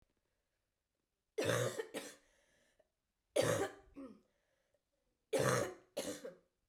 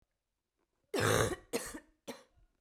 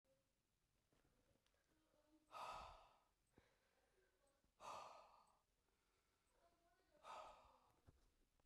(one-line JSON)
{"three_cough_length": "6.7 s", "three_cough_amplitude": 3136, "three_cough_signal_mean_std_ratio": 0.39, "cough_length": "2.6 s", "cough_amplitude": 5821, "cough_signal_mean_std_ratio": 0.38, "exhalation_length": "8.5 s", "exhalation_amplitude": 226, "exhalation_signal_mean_std_ratio": 0.42, "survey_phase": "beta (2021-08-13 to 2022-03-07)", "age": "45-64", "gender": "Female", "wearing_mask": "No", "symptom_cough_any": true, "symptom_runny_or_blocked_nose": true, "symptom_diarrhoea": true, "symptom_onset": "2 days", "smoker_status": "Never smoked", "respiratory_condition_asthma": false, "respiratory_condition_other": false, "recruitment_source": "Test and Trace", "submission_delay": "1 day", "covid_test_result": "Positive", "covid_test_method": "LAMP"}